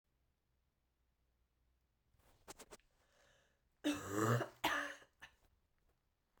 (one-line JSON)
{"cough_length": "6.4 s", "cough_amplitude": 2556, "cough_signal_mean_std_ratio": 0.31, "survey_phase": "beta (2021-08-13 to 2022-03-07)", "age": "18-44", "gender": "Female", "wearing_mask": "No", "symptom_cough_any": true, "symptom_new_continuous_cough": true, "symptom_runny_or_blocked_nose": true, "symptom_sore_throat": true, "symptom_fatigue": true, "symptom_fever_high_temperature": true, "symptom_headache": true, "symptom_change_to_sense_of_smell_or_taste": true, "symptom_loss_of_taste": true, "symptom_onset": "5 days", "smoker_status": "Never smoked", "respiratory_condition_asthma": false, "respiratory_condition_other": false, "recruitment_source": "Test and Trace", "submission_delay": "1 day", "covid_test_result": "Positive", "covid_test_method": "RT-qPCR", "covid_ct_value": 15.0, "covid_ct_gene": "ORF1ab gene", "covid_ct_mean": 15.2, "covid_viral_load": "10000000 copies/ml", "covid_viral_load_category": "High viral load (>1M copies/ml)"}